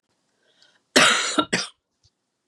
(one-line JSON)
{"cough_length": "2.5 s", "cough_amplitude": 29523, "cough_signal_mean_std_ratio": 0.36, "survey_phase": "beta (2021-08-13 to 2022-03-07)", "age": "45-64", "gender": "Female", "wearing_mask": "No", "symptom_new_continuous_cough": true, "symptom_sore_throat": true, "symptom_diarrhoea": true, "symptom_headache": true, "symptom_loss_of_taste": true, "smoker_status": "Never smoked", "respiratory_condition_asthma": false, "respiratory_condition_other": false, "recruitment_source": "Test and Trace", "submission_delay": "1 day", "covid_test_result": "Positive", "covid_test_method": "LFT"}